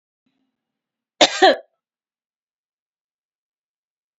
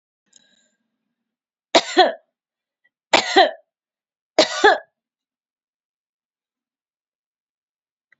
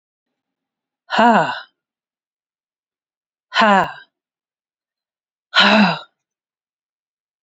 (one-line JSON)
{"cough_length": "4.2 s", "cough_amplitude": 30244, "cough_signal_mean_std_ratio": 0.19, "three_cough_length": "8.2 s", "three_cough_amplitude": 30642, "three_cough_signal_mean_std_ratio": 0.24, "exhalation_length": "7.4 s", "exhalation_amplitude": 31603, "exhalation_signal_mean_std_ratio": 0.31, "survey_phase": "beta (2021-08-13 to 2022-03-07)", "age": "45-64", "gender": "Female", "wearing_mask": "No", "symptom_runny_or_blocked_nose": true, "smoker_status": "Never smoked", "respiratory_condition_asthma": false, "respiratory_condition_other": false, "recruitment_source": "REACT", "submission_delay": "32 days", "covid_test_result": "Negative", "covid_test_method": "RT-qPCR", "influenza_a_test_result": "Negative", "influenza_b_test_result": "Negative"}